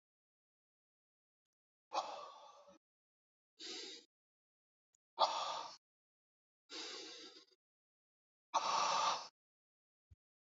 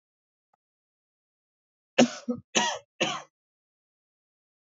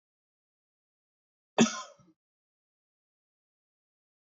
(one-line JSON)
{"exhalation_length": "10.6 s", "exhalation_amplitude": 4121, "exhalation_signal_mean_std_ratio": 0.33, "three_cough_length": "4.6 s", "three_cough_amplitude": 20125, "three_cough_signal_mean_std_ratio": 0.25, "cough_length": "4.4 s", "cough_amplitude": 11725, "cough_signal_mean_std_ratio": 0.14, "survey_phase": "beta (2021-08-13 to 2022-03-07)", "age": "18-44", "gender": "Male", "wearing_mask": "No", "symptom_cough_any": true, "symptom_sore_throat": true, "symptom_onset": "2 days", "smoker_status": "Never smoked", "respiratory_condition_asthma": false, "respiratory_condition_other": false, "recruitment_source": "Test and Trace", "submission_delay": "1 day", "covid_test_result": "Positive", "covid_test_method": "RT-qPCR", "covid_ct_value": 17.1, "covid_ct_gene": "ORF1ab gene", "covid_ct_mean": 17.1, "covid_viral_load": "2500000 copies/ml", "covid_viral_load_category": "High viral load (>1M copies/ml)"}